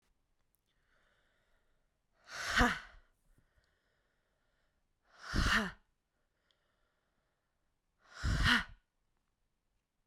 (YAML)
exhalation_length: 10.1 s
exhalation_amplitude: 6409
exhalation_signal_mean_std_ratio: 0.28
survey_phase: beta (2021-08-13 to 2022-03-07)
age: 18-44
gender: Female
wearing_mask: 'No'
symptom_cough_any: true
symptom_sore_throat: true
symptom_fatigue: true
symptom_headache: true
symptom_other: true
symptom_onset: 3 days
smoker_status: Ex-smoker
respiratory_condition_asthma: false
respiratory_condition_other: false
recruitment_source: Test and Trace
submission_delay: 2 days
covid_test_result: Positive
covid_test_method: RT-qPCR
covid_ct_value: 33.4
covid_ct_gene: N gene